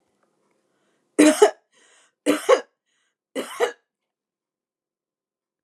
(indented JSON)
{
  "three_cough_length": "5.6 s",
  "three_cough_amplitude": 28761,
  "three_cough_signal_mean_std_ratio": 0.26,
  "survey_phase": "beta (2021-08-13 to 2022-03-07)",
  "age": "65+",
  "gender": "Female",
  "wearing_mask": "No",
  "symptom_none": true,
  "smoker_status": "Never smoked",
  "respiratory_condition_asthma": false,
  "respiratory_condition_other": false,
  "recruitment_source": "REACT",
  "submission_delay": "1 day",
  "covid_test_result": "Negative",
  "covid_test_method": "RT-qPCR",
  "influenza_a_test_result": "Unknown/Void",
  "influenza_b_test_result": "Unknown/Void"
}